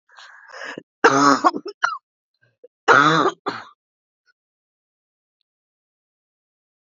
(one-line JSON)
{"cough_length": "6.9 s", "cough_amplitude": 32767, "cough_signal_mean_std_ratio": 0.31, "survey_phase": "beta (2021-08-13 to 2022-03-07)", "age": "45-64", "gender": "Female", "wearing_mask": "No", "symptom_cough_any": true, "symptom_runny_or_blocked_nose": true, "symptom_sore_throat": true, "symptom_fatigue": true, "symptom_headache": true, "symptom_other": true, "smoker_status": "Never smoked", "respiratory_condition_asthma": false, "respiratory_condition_other": false, "recruitment_source": "Test and Trace", "submission_delay": "2 days", "covid_test_result": "Positive", "covid_test_method": "LAMP"}